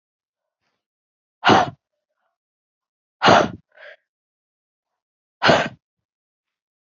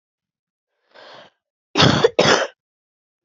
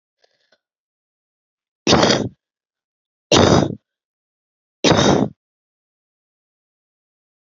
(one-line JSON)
{"exhalation_length": "6.8 s", "exhalation_amplitude": 26847, "exhalation_signal_mean_std_ratio": 0.25, "cough_length": "3.2 s", "cough_amplitude": 30456, "cough_signal_mean_std_ratio": 0.34, "three_cough_length": "7.6 s", "three_cough_amplitude": 32159, "three_cough_signal_mean_std_ratio": 0.31, "survey_phase": "beta (2021-08-13 to 2022-03-07)", "age": "45-64", "gender": "Female", "wearing_mask": "No", "symptom_sore_throat": true, "symptom_headache": true, "symptom_onset": "3 days", "smoker_status": "Never smoked", "respiratory_condition_asthma": true, "respiratory_condition_other": false, "recruitment_source": "REACT", "submission_delay": "1 day", "covid_test_result": "Negative", "covid_test_method": "RT-qPCR"}